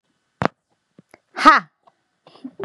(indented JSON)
{
  "exhalation_length": "2.6 s",
  "exhalation_amplitude": 32768,
  "exhalation_signal_mean_std_ratio": 0.23,
  "survey_phase": "beta (2021-08-13 to 2022-03-07)",
  "age": "18-44",
  "gender": "Female",
  "wearing_mask": "No",
  "symptom_none": true,
  "smoker_status": "Never smoked",
  "respiratory_condition_asthma": true,
  "respiratory_condition_other": false,
  "recruitment_source": "REACT",
  "submission_delay": "1 day",
  "covid_test_result": "Negative",
  "covid_test_method": "RT-qPCR",
  "influenza_a_test_result": "Negative",
  "influenza_b_test_result": "Negative"
}